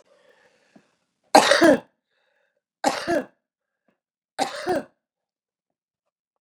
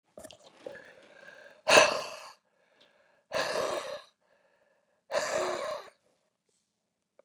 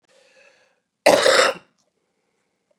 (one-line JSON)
{"three_cough_length": "6.4 s", "three_cough_amplitude": 32659, "three_cough_signal_mean_std_ratio": 0.27, "exhalation_length": "7.2 s", "exhalation_amplitude": 17381, "exhalation_signal_mean_std_ratio": 0.32, "cough_length": "2.8 s", "cough_amplitude": 32372, "cough_signal_mean_std_ratio": 0.31, "survey_phase": "beta (2021-08-13 to 2022-03-07)", "age": "45-64", "gender": "Female", "wearing_mask": "No", "symptom_runny_or_blocked_nose": true, "symptom_fatigue": true, "symptom_onset": "12 days", "smoker_status": "Ex-smoker", "respiratory_condition_asthma": true, "respiratory_condition_other": false, "recruitment_source": "REACT", "submission_delay": "2 days", "covid_test_result": "Negative", "covid_test_method": "RT-qPCR", "influenza_a_test_result": "Negative", "influenza_b_test_result": "Negative"}